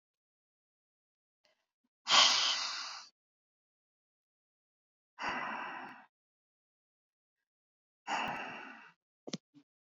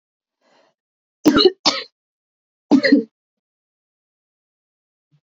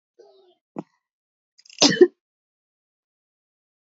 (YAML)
exhalation_length: 9.8 s
exhalation_amplitude: 8621
exhalation_signal_mean_std_ratio: 0.29
three_cough_length: 5.3 s
three_cough_amplitude: 29350
three_cough_signal_mean_std_ratio: 0.27
cough_length: 3.9 s
cough_amplitude: 28007
cough_signal_mean_std_ratio: 0.18
survey_phase: beta (2021-08-13 to 2022-03-07)
age: 18-44
gender: Female
wearing_mask: 'No'
symptom_cough_any: true
symptom_runny_or_blocked_nose: true
symptom_fatigue: true
symptom_headache: true
symptom_change_to_sense_of_smell_or_taste: true
symptom_onset: 2 days
smoker_status: Never smoked
respiratory_condition_asthma: false
respiratory_condition_other: false
recruitment_source: Test and Trace
submission_delay: 2 days
covid_test_result: Positive
covid_test_method: RT-qPCR
covid_ct_value: 20.7
covid_ct_gene: ORF1ab gene
covid_ct_mean: 21.8
covid_viral_load: 72000 copies/ml
covid_viral_load_category: Low viral load (10K-1M copies/ml)